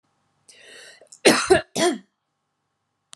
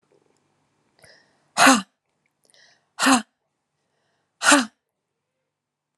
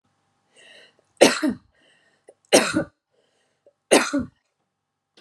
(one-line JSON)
{"cough_length": "3.2 s", "cough_amplitude": 28415, "cough_signal_mean_std_ratio": 0.31, "exhalation_length": "6.0 s", "exhalation_amplitude": 31042, "exhalation_signal_mean_std_ratio": 0.25, "three_cough_length": "5.2 s", "three_cough_amplitude": 32767, "three_cough_signal_mean_std_ratio": 0.28, "survey_phase": "alpha (2021-03-01 to 2021-08-12)", "age": "18-44", "gender": "Female", "wearing_mask": "No", "symptom_none": true, "smoker_status": "Ex-smoker", "respiratory_condition_asthma": false, "respiratory_condition_other": false, "recruitment_source": "REACT", "submission_delay": "3 days", "covid_test_result": "Negative", "covid_test_method": "RT-qPCR"}